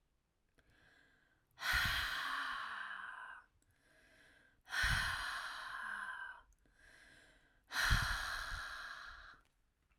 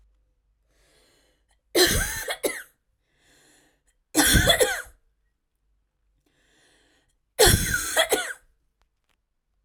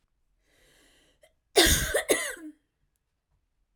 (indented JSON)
{
  "exhalation_length": "10.0 s",
  "exhalation_amplitude": 3234,
  "exhalation_signal_mean_std_ratio": 0.55,
  "three_cough_length": "9.6 s",
  "three_cough_amplitude": 21927,
  "three_cough_signal_mean_std_ratio": 0.35,
  "cough_length": "3.8 s",
  "cough_amplitude": 16168,
  "cough_signal_mean_std_ratio": 0.32,
  "survey_phase": "alpha (2021-03-01 to 2021-08-12)",
  "age": "18-44",
  "gender": "Female",
  "wearing_mask": "No",
  "symptom_cough_any": true,
  "smoker_status": "Never smoked",
  "respiratory_condition_asthma": true,
  "respiratory_condition_other": false,
  "recruitment_source": "Test and Trace",
  "submission_delay": "0 days",
  "covid_test_result": "Negative",
  "covid_test_method": "LFT"
}